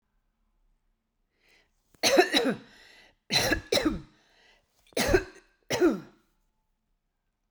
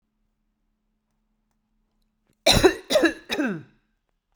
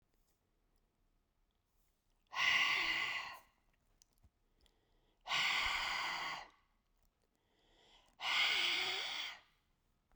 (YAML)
three_cough_length: 7.5 s
three_cough_amplitude: 16466
three_cough_signal_mean_std_ratio: 0.36
cough_length: 4.4 s
cough_amplitude: 23039
cough_signal_mean_std_ratio: 0.31
exhalation_length: 10.2 s
exhalation_amplitude: 2529
exhalation_signal_mean_std_ratio: 0.48
survey_phase: beta (2021-08-13 to 2022-03-07)
age: 45-64
gender: Female
wearing_mask: 'No'
symptom_none: true
smoker_status: Ex-smoker
respiratory_condition_asthma: false
respiratory_condition_other: false
recruitment_source: REACT
submission_delay: 2 days
covid_test_result: Negative
covid_test_method: RT-qPCR